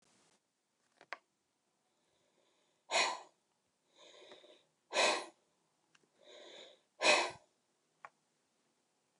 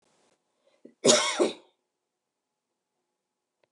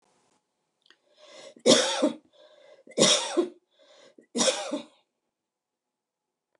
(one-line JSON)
{"exhalation_length": "9.2 s", "exhalation_amplitude": 5552, "exhalation_signal_mean_std_ratio": 0.25, "cough_length": "3.7 s", "cough_amplitude": 16626, "cough_signal_mean_std_ratio": 0.26, "three_cough_length": "6.6 s", "three_cough_amplitude": 24131, "three_cough_signal_mean_std_ratio": 0.33, "survey_phase": "beta (2021-08-13 to 2022-03-07)", "age": "45-64", "gender": "Female", "wearing_mask": "No", "symptom_none": true, "smoker_status": "Never smoked", "respiratory_condition_asthma": true, "respiratory_condition_other": false, "recruitment_source": "REACT", "submission_delay": "1 day", "covid_test_result": "Negative", "covid_test_method": "RT-qPCR", "influenza_a_test_result": "Negative", "influenza_b_test_result": "Negative"}